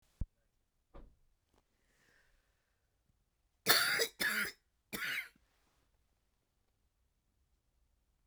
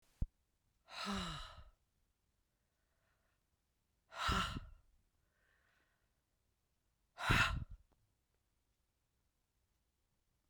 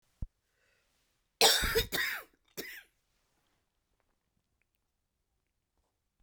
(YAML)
three_cough_length: 8.3 s
three_cough_amplitude: 8387
three_cough_signal_mean_std_ratio: 0.27
exhalation_length: 10.5 s
exhalation_amplitude: 3997
exhalation_signal_mean_std_ratio: 0.28
cough_length: 6.2 s
cough_amplitude: 12511
cough_signal_mean_std_ratio: 0.26
survey_phase: beta (2021-08-13 to 2022-03-07)
age: 45-64
gender: Female
wearing_mask: 'No'
symptom_cough_any: true
symptom_runny_or_blocked_nose: true
symptom_fatigue: true
symptom_change_to_sense_of_smell_or_taste: true
symptom_onset: 8 days
smoker_status: Never smoked
respiratory_condition_asthma: true
respiratory_condition_other: false
recruitment_source: Test and Trace
submission_delay: 2 days
covid_test_result: Positive
covid_test_method: RT-qPCR
covid_ct_value: 23.5
covid_ct_gene: N gene
covid_ct_mean: 23.6
covid_viral_load: 18000 copies/ml
covid_viral_load_category: Low viral load (10K-1M copies/ml)